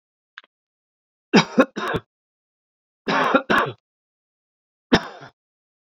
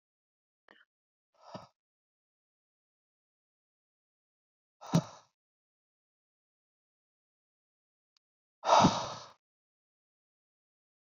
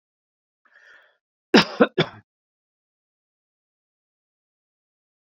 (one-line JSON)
{"three_cough_length": "6.0 s", "three_cough_amplitude": 28702, "three_cough_signal_mean_std_ratio": 0.3, "exhalation_length": "11.2 s", "exhalation_amplitude": 9389, "exhalation_signal_mean_std_ratio": 0.16, "cough_length": "5.3 s", "cough_amplitude": 27191, "cough_signal_mean_std_ratio": 0.16, "survey_phase": "beta (2021-08-13 to 2022-03-07)", "age": "18-44", "gender": "Male", "wearing_mask": "No", "symptom_none": true, "smoker_status": "Current smoker (1 to 10 cigarettes per day)", "respiratory_condition_asthma": false, "respiratory_condition_other": false, "recruitment_source": "REACT", "submission_delay": "1 day", "covid_test_result": "Negative", "covid_test_method": "RT-qPCR"}